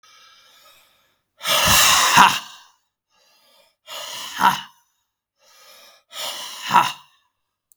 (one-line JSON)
{"exhalation_length": "7.8 s", "exhalation_amplitude": 32768, "exhalation_signal_mean_std_ratio": 0.36, "survey_phase": "beta (2021-08-13 to 2022-03-07)", "age": "45-64", "gender": "Male", "wearing_mask": "No", "symptom_none": true, "smoker_status": "Never smoked", "respiratory_condition_asthma": true, "respiratory_condition_other": false, "recruitment_source": "REACT", "submission_delay": "1 day", "covid_test_result": "Negative", "covid_test_method": "RT-qPCR", "influenza_a_test_result": "Negative", "influenza_b_test_result": "Negative"}